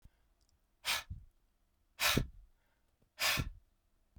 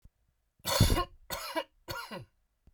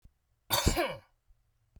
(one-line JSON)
{"exhalation_length": "4.2 s", "exhalation_amplitude": 5033, "exhalation_signal_mean_std_ratio": 0.36, "three_cough_length": "2.7 s", "three_cough_amplitude": 9955, "three_cough_signal_mean_std_ratio": 0.4, "cough_length": "1.8 s", "cough_amplitude": 8637, "cough_signal_mean_std_ratio": 0.38, "survey_phase": "beta (2021-08-13 to 2022-03-07)", "age": "45-64", "gender": "Male", "wearing_mask": "No", "symptom_cough_any": true, "symptom_sore_throat": true, "symptom_abdominal_pain": true, "symptom_fatigue": true, "symptom_other": true, "symptom_onset": "3 days", "smoker_status": "Current smoker (1 to 10 cigarettes per day)", "respiratory_condition_asthma": false, "respiratory_condition_other": false, "recruitment_source": "Test and Trace", "submission_delay": "2 days", "covid_test_result": "Positive", "covid_test_method": "RT-qPCR", "covid_ct_value": 25.9, "covid_ct_gene": "ORF1ab gene"}